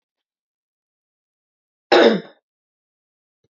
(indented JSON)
{
  "cough_length": "3.5 s",
  "cough_amplitude": 27681,
  "cough_signal_mean_std_ratio": 0.22,
  "survey_phase": "beta (2021-08-13 to 2022-03-07)",
  "age": "45-64",
  "gender": "Female",
  "wearing_mask": "No",
  "symptom_none": true,
  "smoker_status": "Never smoked",
  "respiratory_condition_asthma": false,
  "respiratory_condition_other": false,
  "recruitment_source": "REACT",
  "submission_delay": "2 days",
  "covid_test_result": "Negative",
  "covid_test_method": "RT-qPCR"
}